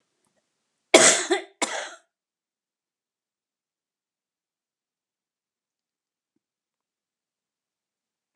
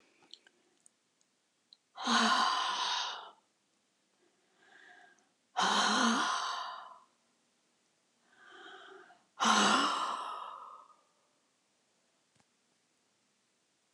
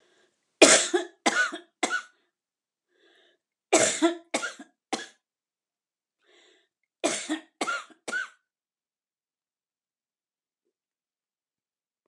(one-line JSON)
{"cough_length": "8.4 s", "cough_amplitude": 32675, "cough_signal_mean_std_ratio": 0.17, "exhalation_length": "13.9 s", "exhalation_amplitude": 6579, "exhalation_signal_mean_std_ratio": 0.41, "three_cough_length": "12.1 s", "three_cough_amplitude": 31152, "three_cough_signal_mean_std_ratio": 0.27, "survey_phase": "alpha (2021-03-01 to 2021-08-12)", "age": "65+", "gender": "Female", "wearing_mask": "No", "symptom_none": true, "smoker_status": "Never smoked", "respiratory_condition_asthma": false, "respiratory_condition_other": false, "recruitment_source": "REACT", "submission_delay": "11 days", "covid_test_result": "Negative", "covid_test_method": "RT-qPCR"}